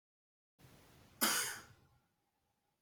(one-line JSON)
{"cough_length": "2.8 s", "cough_amplitude": 3699, "cough_signal_mean_std_ratio": 0.3, "survey_phase": "alpha (2021-03-01 to 2021-08-12)", "age": "18-44", "gender": "Male", "wearing_mask": "No", "symptom_cough_any": true, "symptom_fatigue": true, "symptom_headache": true, "symptom_change_to_sense_of_smell_or_taste": true, "symptom_loss_of_taste": true, "symptom_onset": "3 days", "smoker_status": "Never smoked", "respiratory_condition_asthma": false, "respiratory_condition_other": false, "recruitment_source": "Test and Trace", "submission_delay": "2 days", "covid_test_result": "Positive", "covid_test_method": "RT-qPCR", "covid_ct_value": 21.1, "covid_ct_gene": "ORF1ab gene", "covid_ct_mean": 21.8, "covid_viral_load": "73000 copies/ml", "covid_viral_load_category": "Low viral load (10K-1M copies/ml)"}